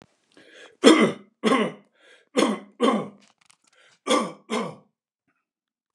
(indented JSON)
{
  "cough_length": "5.9 s",
  "cough_amplitude": 29203,
  "cough_signal_mean_std_ratio": 0.36,
  "survey_phase": "beta (2021-08-13 to 2022-03-07)",
  "age": "65+",
  "gender": "Male",
  "wearing_mask": "No",
  "symptom_runny_or_blocked_nose": true,
  "smoker_status": "Ex-smoker",
  "respiratory_condition_asthma": false,
  "respiratory_condition_other": false,
  "recruitment_source": "REACT",
  "submission_delay": "0 days",
  "covid_test_result": "Negative",
  "covid_test_method": "RT-qPCR",
  "influenza_a_test_result": "Negative",
  "influenza_b_test_result": "Negative"
}